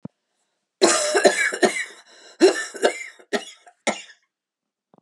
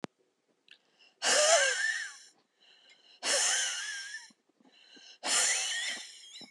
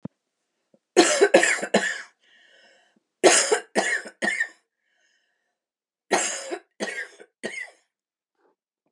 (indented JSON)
{
  "cough_length": "5.0 s",
  "cough_amplitude": 29661,
  "cough_signal_mean_std_ratio": 0.41,
  "exhalation_length": "6.5 s",
  "exhalation_amplitude": 8721,
  "exhalation_signal_mean_std_ratio": 0.52,
  "three_cough_length": "8.9 s",
  "three_cough_amplitude": 28538,
  "three_cough_signal_mean_std_ratio": 0.36,
  "survey_phase": "beta (2021-08-13 to 2022-03-07)",
  "age": "45-64",
  "gender": "Female",
  "wearing_mask": "No",
  "symptom_cough_any": true,
  "symptom_shortness_of_breath": true,
  "symptom_sore_throat": true,
  "smoker_status": "Never smoked",
  "respiratory_condition_asthma": false,
  "respiratory_condition_other": false,
  "recruitment_source": "REACT",
  "submission_delay": "1 day",
  "covid_test_result": "Negative",
  "covid_test_method": "RT-qPCR"
}